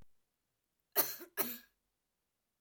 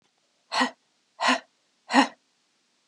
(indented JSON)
{
  "cough_length": "2.6 s",
  "cough_amplitude": 6315,
  "cough_signal_mean_std_ratio": 0.27,
  "exhalation_length": "2.9 s",
  "exhalation_amplitude": 23151,
  "exhalation_signal_mean_std_ratio": 0.32,
  "survey_phase": "alpha (2021-03-01 to 2021-08-12)",
  "age": "18-44",
  "gender": "Female",
  "wearing_mask": "No",
  "symptom_none": true,
  "smoker_status": "Never smoked",
  "respiratory_condition_asthma": false,
  "respiratory_condition_other": false,
  "recruitment_source": "REACT",
  "submission_delay": "2 days",
  "covid_test_result": "Negative",
  "covid_test_method": "RT-qPCR"
}